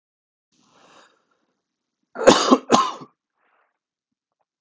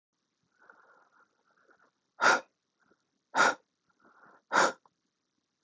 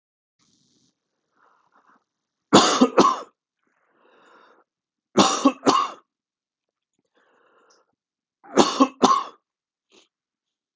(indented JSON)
{
  "cough_length": "4.6 s",
  "cough_amplitude": 32768,
  "cough_signal_mean_std_ratio": 0.25,
  "exhalation_length": "5.6 s",
  "exhalation_amplitude": 9693,
  "exhalation_signal_mean_std_ratio": 0.25,
  "three_cough_length": "10.8 s",
  "three_cough_amplitude": 31860,
  "three_cough_signal_mean_std_ratio": 0.29,
  "survey_phase": "beta (2021-08-13 to 2022-03-07)",
  "age": "18-44",
  "gender": "Male",
  "wearing_mask": "No",
  "symptom_cough_any": true,
  "symptom_runny_or_blocked_nose": true,
  "symptom_headache": true,
  "symptom_onset": "2 days",
  "smoker_status": "Never smoked",
  "respiratory_condition_asthma": false,
  "respiratory_condition_other": false,
  "recruitment_source": "Test and Trace",
  "submission_delay": "1 day",
  "covid_test_result": "Positive",
  "covid_test_method": "RT-qPCR"
}